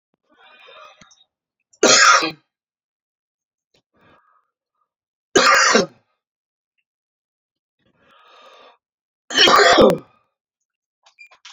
three_cough_length: 11.5 s
three_cough_amplitude: 32768
three_cough_signal_mean_std_ratio: 0.31
survey_phase: alpha (2021-03-01 to 2021-08-12)
age: 45-64
gender: Female
wearing_mask: 'No'
symptom_fatigue: true
symptom_headache: true
symptom_onset: 12 days
smoker_status: Current smoker (1 to 10 cigarettes per day)
respiratory_condition_asthma: false
respiratory_condition_other: false
recruitment_source: REACT
submission_delay: 2 days
covid_test_result: Negative
covid_test_method: RT-qPCR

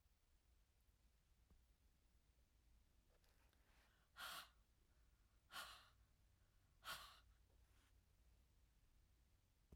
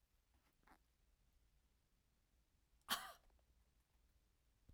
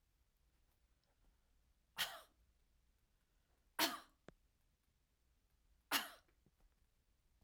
exhalation_length: 9.8 s
exhalation_amplitude: 275
exhalation_signal_mean_std_ratio: 0.47
cough_length: 4.7 s
cough_amplitude: 1481
cough_signal_mean_std_ratio: 0.22
three_cough_length: 7.4 s
three_cough_amplitude: 2819
three_cough_signal_mean_std_ratio: 0.22
survey_phase: beta (2021-08-13 to 2022-03-07)
age: 65+
gender: Female
wearing_mask: 'No'
symptom_none: true
smoker_status: Ex-smoker
respiratory_condition_asthma: false
respiratory_condition_other: false
recruitment_source: REACT
submission_delay: 1 day
covid_test_result: Negative
covid_test_method: RT-qPCR
influenza_a_test_result: Negative
influenza_b_test_result: Negative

